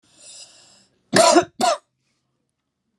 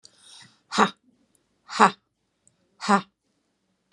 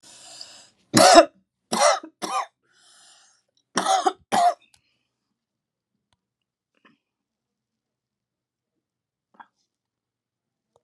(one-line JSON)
{"cough_length": "3.0 s", "cough_amplitude": 31741, "cough_signal_mean_std_ratio": 0.32, "exhalation_length": "3.9 s", "exhalation_amplitude": 31918, "exhalation_signal_mean_std_ratio": 0.23, "three_cough_length": "10.8 s", "three_cough_amplitude": 32767, "three_cough_signal_mean_std_ratio": 0.25, "survey_phase": "alpha (2021-03-01 to 2021-08-12)", "age": "65+", "gender": "Female", "wearing_mask": "No", "symptom_none": true, "smoker_status": "Never smoked", "respiratory_condition_asthma": true, "respiratory_condition_other": false, "recruitment_source": "REACT", "submission_delay": "3 days", "covid_test_result": "Negative", "covid_test_method": "RT-qPCR"}